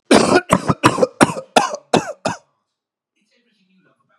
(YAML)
cough_length: 4.2 s
cough_amplitude: 32768
cough_signal_mean_std_ratio: 0.38
survey_phase: beta (2021-08-13 to 2022-03-07)
age: 45-64
gender: Female
wearing_mask: 'No'
symptom_cough_any: true
symptom_new_continuous_cough: true
symptom_runny_or_blocked_nose: true
symptom_shortness_of_breath: true
symptom_sore_throat: true
symptom_abdominal_pain: true
symptom_diarrhoea: true
symptom_fatigue: true
symptom_fever_high_temperature: true
symptom_headache: true
smoker_status: Never smoked
respiratory_condition_asthma: false
respiratory_condition_other: false
recruitment_source: Test and Trace
submission_delay: 2 days
covid_test_result: Negative
covid_test_method: LFT